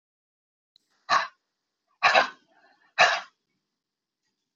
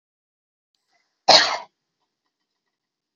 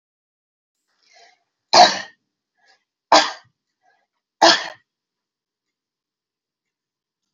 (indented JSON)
{
  "exhalation_length": "4.6 s",
  "exhalation_amplitude": 18124,
  "exhalation_signal_mean_std_ratio": 0.27,
  "cough_length": "3.2 s",
  "cough_amplitude": 29531,
  "cough_signal_mean_std_ratio": 0.21,
  "three_cough_length": "7.3 s",
  "three_cough_amplitude": 32067,
  "three_cough_signal_mean_std_ratio": 0.22,
  "survey_phase": "beta (2021-08-13 to 2022-03-07)",
  "age": "65+",
  "gender": "Female",
  "wearing_mask": "No",
  "symptom_runny_or_blocked_nose": true,
  "symptom_onset": "4 days",
  "smoker_status": "Never smoked",
  "respiratory_condition_asthma": false,
  "respiratory_condition_other": false,
  "recruitment_source": "REACT",
  "submission_delay": "1 day",
  "covid_test_result": "Negative",
  "covid_test_method": "RT-qPCR",
  "influenza_a_test_result": "Negative",
  "influenza_b_test_result": "Negative"
}